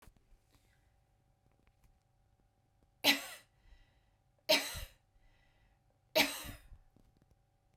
{"three_cough_length": "7.8 s", "three_cough_amplitude": 6439, "three_cough_signal_mean_std_ratio": 0.24, "survey_phase": "beta (2021-08-13 to 2022-03-07)", "age": "45-64", "gender": "Female", "wearing_mask": "No", "symptom_none": true, "symptom_onset": "7 days", "smoker_status": "Ex-smoker", "respiratory_condition_asthma": false, "respiratory_condition_other": false, "recruitment_source": "REACT", "submission_delay": "2 days", "covid_test_result": "Negative", "covid_test_method": "RT-qPCR", "influenza_a_test_result": "Negative", "influenza_b_test_result": "Negative"}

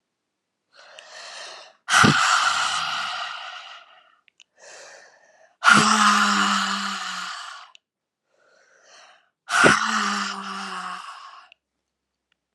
{"exhalation_length": "12.5 s", "exhalation_amplitude": 31175, "exhalation_signal_mean_std_ratio": 0.47, "survey_phase": "beta (2021-08-13 to 2022-03-07)", "age": "45-64", "gender": "Female", "wearing_mask": "No", "symptom_cough_any": true, "symptom_runny_or_blocked_nose": true, "symptom_shortness_of_breath": true, "symptom_fatigue": true, "symptom_onset": "6 days", "smoker_status": "Never smoked", "respiratory_condition_asthma": false, "respiratory_condition_other": false, "recruitment_source": "Test and Trace", "submission_delay": "2 days", "covid_test_result": "Positive", "covid_test_method": "RT-qPCR"}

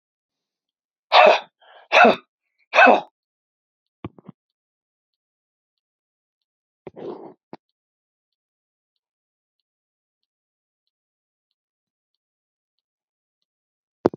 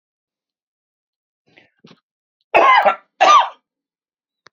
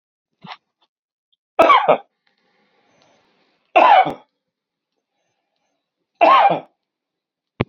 {"exhalation_length": "14.2 s", "exhalation_amplitude": 30739, "exhalation_signal_mean_std_ratio": 0.19, "cough_length": "4.5 s", "cough_amplitude": 30476, "cough_signal_mean_std_ratio": 0.32, "three_cough_length": "7.7 s", "three_cough_amplitude": 28917, "three_cough_signal_mean_std_ratio": 0.31, "survey_phase": "beta (2021-08-13 to 2022-03-07)", "age": "45-64", "gender": "Male", "wearing_mask": "No", "symptom_none": true, "symptom_onset": "12 days", "smoker_status": "Never smoked", "respiratory_condition_asthma": true, "respiratory_condition_other": false, "recruitment_source": "REACT", "submission_delay": "1 day", "covid_test_result": "Negative", "covid_test_method": "RT-qPCR", "influenza_a_test_result": "Unknown/Void", "influenza_b_test_result": "Unknown/Void"}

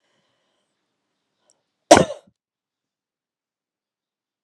{"cough_length": "4.4 s", "cough_amplitude": 32768, "cough_signal_mean_std_ratio": 0.13, "survey_phase": "alpha (2021-03-01 to 2021-08-12)", "age": "45-64", "gender": "Female", "wearing_mask": "No", "symptom_none": true, "symptom_onset": "12 days", "smoker_status": "Never smoked", "respiratory_condition_asthma": true, "respiratory_condition_other": false, "recruitment_source": "REACT", "submission_delay": "2 days", "covid_test_result": "Negative", "covid_test_method": "RT-qPCR"}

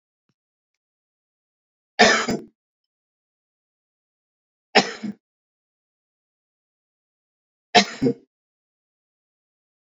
{"three_cough_length": "10.0 s", "three_cough_amplitude": 31572, "three_cough_signal_mean_std_ratio": 0.2, "survey_phase": "beta (2021-08-13 to 2022-03-07)", "age": "45-64", "gender": "Male", "wearing_mask": "No", "symptom_none": true, "smoker_status": "Current smoker (11 or more cigarettes per day)", "respiratory_condition_asthma": false, "respiratory_condition_other": false, "recruitment_source": "REACT", "submission_delay": "1 day", "covid_test_result": "Negative", "covid_test_method": "RT-qPCR"}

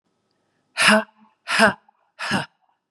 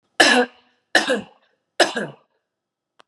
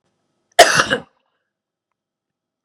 {"exhalation_length": "2.9 s", "exhalation_amplitude": 31356, "exhalation_signal_mean_std_ratio": 0.37, "three_cough_length": "3.1 s", "three_cough_amplitude": 32767, "three_cough_signal_mean_std_ratio": 0.36, "cough_length": "2.6 s", "cough_amplitude": 32768, "cough_signal_mean_std_ratio": 0.24, "survey_phase": "beta (2021-08-13 to 2022-03-07)", "age": "45-64", "gender": "Female", "wearing_mask": "No", "symptom_none": true, "smoker_status": "Never smoked", "respiratory_condition_asthma": false, "respiratory_condition_other": false, "recruitment_source": "Test and Trace", "submission_delay": "2 days", "covid_test_result": "Positive", "covid_test_method": "LFT"}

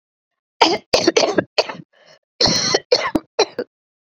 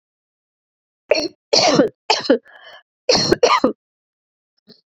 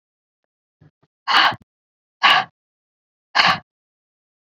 {"cough_length": "4.1 s", "cough_amplitude": 29225, "cough_signal_mean_std_ratio": 0.44, "three_cough_length": "4.9 s", "three_cough_amplitude": 29666, "three_cough_signal_mean_std_ratio": 0.4, "exhalation_length": "4.4 s", "exhalation_amplitude": 32768, "exhalation_signal_mean_std_ratio": 0.31, "survey_phase": "beta (2021-08-13 to 2022-03-07)", "age": "45-64", "gender": "Female", "wearing_mask": "No", "symptom_cough_any": true, "symptom_runny_or_blocked_nose": true, "symptom_abdominal_pain": true, "symptom_fatigue": true, "symptom_fever_high_temperature": true, "symptom_headache": true, "smoker_status": "Never smoked", "respiratory_condition_asthma": false, "respiratory_condition_other": false, "recruitment_source": "Test and Trace", "submission_delay": "2 days", "covid_test_result": "Positive", "covid_test_method": "RT-qPCR", "covid_ct_value": 19.1, "covid_ct_gene": "ORF1ab gene", "covid_ct_mean": 20.0, "covid_viral_load": "270000 copies/ml", "covid_viral_load_category": "Low viral load (10K-1M copies/ml)"}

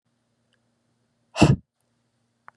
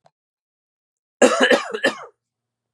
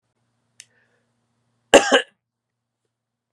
{"exhalation_length": "2.6 s", "exhalation_amplitude": 26789, "exhalation_signal_mean_std_ratio": 0.2, "three_cough_length": "2.7 s", "three_cough_amplitude": 32202, "three_cough_signal_mean_std_ratio": 0.34, "cough_length": "3.3 s", "cough_amplitude": 32768, "cough_signal_mean_std_ratio": 0.19, "survey_phase": "beta (2021-08-13 to 2022-03-07)", "age": "45-64", "gender": "Male", "wearing_mask": "No", "symptom_cough_any": true, "symptom_new_continuous_cough": true, "symptom_runny_or_blocked_nose": true, "symptom_sore_throat": true, "symptom_onset": "4 days", "smoker_status": "Ex-smoker", "respiratory_condition_asthma": false, "respiratory_condition_other": false, "recruitment_source": "Test and Trace", "submission_delay": "2 days", "covid_test_result": "Positive", "covid_test_method": "RT-qPCR"}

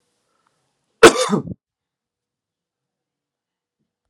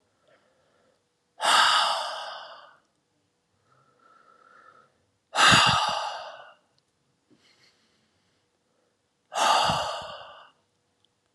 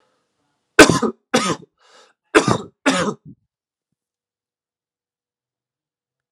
{"cough_length": "4.1 s", "cough_amplitude": 32768, "cough_signal_mean_std_ratio": 0.18, "exhalation_length": "11.3 s", "exhalation_amplitude": 18413, "exhalation_signal_mean_std_ratio": 0.36, "three_cough_length": "6.3 s", "three_cough_amplitude": 32768, "three_cough_signal_mean_std_ratio": 0.26, "survey_phase": "alpha (2021-03-01 to 2021-08-12)", "age": "18-44", "gender": "Male", "wearing_mask": "No", "symptom_headache": true, "smoker_status": "Never smoked", "respiratory_condition_asthma": false, "respiratory_condition_other": false, "recruitment_source": "Test and Trace", "submission_delay": "1 day", "covid_test_result": "Positive", "covid_test_method": "RT-qPCR", "covid_ct_value": 23.3, "covid_ct_gene": "ORF1ab gene", "covid_ct_mean": 23.5, "covid_viral_load": "20000 copies/ml", "covid_viral_load_category": "Low viral load (10K-1M copies/ml)"}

